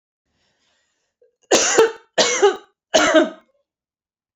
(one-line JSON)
{"three_cough_length": "4.4 s", "three_cough_amplitude": 27504, "three_cough_signal_mean_std_ratio": 0.4, "survey_phase": "beta (2021-08-13 to 2022-03-07)", "age": "45-64", "gender": "Female", "wearing_mask": "No", "symptom_cough_any": true, "symptom_headache": true, "symptom_onset": "8 days", "smoker_status": "Ex-smoker", "respiratory_condition_asthma": false, "respiratory_condition_other": false, "recruitment_source": "Test and Trace", "submission_delay": "2 days", "covid_test_result": "Positive", "covid_test_method": "RT-qPCR", "covid_ct_value": 19.2, "covid_ct_gene": "ORF1ab gene", "covid_ct_mean": 19.6, "covid_viral_load": "370000 copies/ml", "covid_viral_load_category": "Low viral load (10K-1M copies/ml)"}